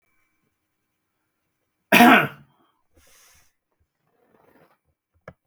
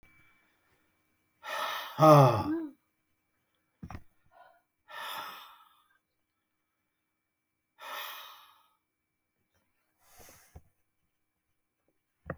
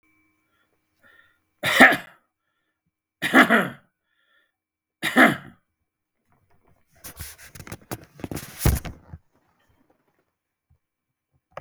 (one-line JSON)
{"cough_length": "5.5 s", "cough_amplitude": 32766, "cough_signal_mean_std_ratio": 0.2, "exhalation_length": "12.4 s", "exhalation_amplitude": 16470, "exhalation_signal_mean_std_ratio": 0.21, "three_cough_length": "11.6 s", "three_cough_amplitude": 32768, "three_cough_signal_mean_std_ratio": 0.25, "survey_phase": "beta (2021-08-13 to 2022-03-07)", "age": "65+", "gender": "Male", "wearing_mask": "No", "symptom_none": true, "smoker_status": "Never smoked", "respiratory_condition_asthma": false, "respiratory_condition_other": false, "recruitment_source": "REACT", "submission_delay": "2 days", "covid_test_result": "Negative", "covid_test_method": "RT-qPCR", "influenza_a_test_result": "Negative", "influenza_b_test_result": "Negative"}